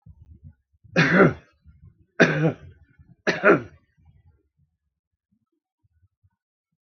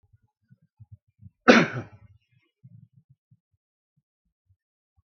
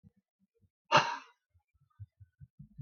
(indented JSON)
{
  "three_cough_length": "6.8 s",
  "three_cough_amplitude": 27329,
  "three_cough_signal_mean_std_ratio": 0.29,
  "cough_length": "5.0 s",
  "cough_amplitude": 32766,
  "cough_signal_mean_std_ratio": 0.17,
  "exhalation_length": "2.8 s",
  "exhalation_amplitude": 9969,
  "exhalation_signal_mean_std_ratio": 0.22,
  "survey_phase": "beta (2021-08-13 to 2022-03-07)",
  "age": "65+",
  "gender": "Male",
  "wearing_mask": "No",
  "symptom_none": true,
  "smoker_status": "Never smoked",
  "respiratory_condition_asthma": false,
  "respiratory_condition_other": false,
  "recruitment_source": "REACT",
  "submission_delay": "2 days",
  "covid_test_result": "Negative",
  "covid_test_method": "RT-qPCR"
}